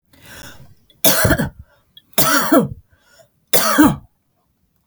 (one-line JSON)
{"three_cough_length": "4.9 s", "three_cough_amplitude": 32768, "three_cough_signal_mean_std_ratio": 0.44, "survey_phase": "beta (2021-08-13 to 2022-03-07)", "age": "45-64", "gender": "Female", "wearing_mask": "No", "symptom_none": true, "smoker_status": "Never smoked", "respiratory_condition_asthma": false, "respiratory_condition_other": false, "recruitment_source": "REACT", "submission_delay": "3 days", "covid_test_result": "Negative", "covid_test_method": "RT-qPCR", "influenza_a_test_result": "Negative", "influenza_b_test_result": "Negative"}